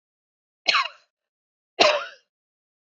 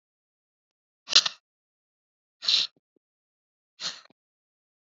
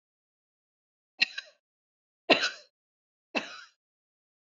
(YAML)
cough_length: 3.0 s
cough_amplitude: 27797
cough_signal_mean_std_ratio: 0.28
exhalation_length: 4.9 s
exhalation_amplitude: 26081
exhalation_signal_mean_std_ratio: 0.19
three_cough_length: 4.5 s
three_cough_amplitude: 13862
three_cough_signal_mean_std_ratio: 0.2
survey_phase: beta (2021-08-13 to 2022-03-07)
age: 45-64
gender: Female
wearing_mask: 'No'
symptom_none: true
smoker_status: Ex-smoker
respiratory_condition_asthma: false
respiratory_condition_other: false
recruitment_source: REACT
submission_delay: 0 days
covid_test_result: Negative
covid_test_method: RT-qPCR
influenza_a_test_result: Negative
influenza_b_test_result: Negative